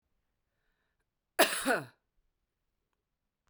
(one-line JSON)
{"cough_length": "3.5 s", "cough_amplitude": 12199, "cough_signal_mean_std_ratio": 0.23, "survey_phase": "beta (2021-08-13 to 2022-03-07)", "age": "45-64", "gender": "Female", "wearing_mask": "No", "symptom_runny_or_blocked_nose": true, "smoker_status": "Never smoked", "respiratory_condition_asthma": false, "respiratory_condition_other": false, "recruitment_source": "REACT", "submission_delay": "2 days", "covid_test_result": "Negative", "covid_test_method": "RT-qPCR", "influenza_a_test_result": "Negative", "influenza_b_test_result": "Negative"}